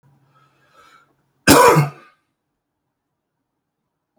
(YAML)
cough_length: 4.2 s
cough_amplitude: 32768
cough_signal_mean_std_ratio: 0.26
survey_phase: beta (2021-08-13 to 2022-03-07)
age: 45-64
gender: Male
wearing_mask: 'No'
symptom_cough_any: true
symptom_fever_high_temperature: true
symptom_onset: 3 days
smoker_status: Ex-smoker
respiratory_condition_asthma: false
respiratory_condition_other: false
recruitment_source: Test and Trace
submission_delay: 1 day
covid_test_result: Positive
covid_test_method: RT-qPCR
covid_ct_value: 17.1
covid_ct_gene: ORF1ab gene
covid_ct_mean: 18.4
covid_viral_load: 910000 copies/ml
covid_viral_load_category: Low viral load (10K-1M copies/ml)